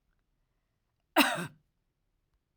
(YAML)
cough_length: 2.6 s
cough_amplitude: 11602
cough_signal_mean_std_ratio: 0.23
survey_phase: alpha (2021-03-01 to 2021-08-12)
age: 45-64
gender: Female
wearing_mask: 'No'
symptom_none: true
symptom_onset: 4 days
smoker_status: Never smoked
respiratory_condition_asthma: false
respiratory_condition_other: false
recruitment_source: REACT
submission_delay: 1 day
covid_test_result: Negative
covid_test_method: RT-qPCR